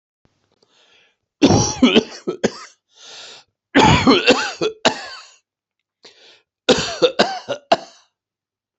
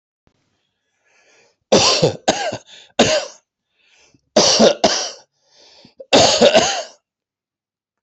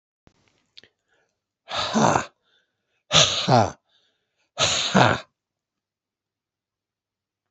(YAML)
cough_length: 8.8 s
cough_amplitude: 32603
cough_signal_mean_std_ratio: 0.39
three_cough_length: 8.0 s
three_cough_amplitude: 31362
three_cough_signal_mean_std_ratio: 0.42
exhalation_length: 7.5 s
exhalation_amplitude: 27887
exhalation_signal_mean_std_ratio: 0.34
survey_phase: beta (2021-08-13 to 2022-03-07)
age: 65+
gender: Male
wearing_mask: 'No'
symptom_cough_any: true
symptom_fatigue: true
symptom_onset: 8 days
smoker_status: Never smoked
respiratory_condition_asthma: false
respiratory_condition_other: false
recruitment_source: Test and Trace
submission_delay: 1 day
covid_test_result: Negative
covid_test_method: RT-qPCR